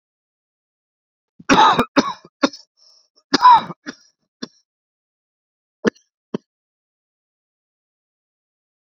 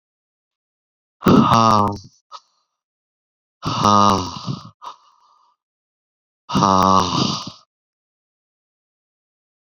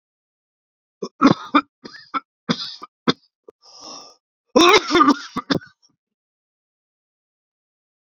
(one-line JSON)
{"cough_length": "8.9 s", "cough_amplitude": 29772, "cough_signal_mean_std_ratio": 0.24, "exhalation_length": "9.7 s", "exhalation_amplitude": 29542, "exhalation_signal_mean_std_ratio": 0.38, "three_cough_length": "8.1 s", "three_cough_amplitude": 30190, "three_cough_signal_mean_std_ratio": 0.29, "survey_phase": "beta (2021-08-13 to 2022-03-07)", "age": "45-64", "gender": "Male", "wearing_mask": "No", "symptom_cough_any": true, "symptom_runny_or_blocked_nose": true, "symptom_shortness_of_breath": true, "symptom_sore_throat": true, "symptom_abdominal_pain": true, "symptom_diarrhoea": true, "symptom_fatigue": true, "symptom_headache": true, "symptom_loss_of_taste": true, "smoker_status": "Prefer not to say", "respiratory_condition_asthma": false, "respiratory_condition_other": false, "recruitment_source": "Test and Trace", "submission_delay": "1 day", "covid_test_result": "Positive", "covid_test_method": "RT-qPCR"}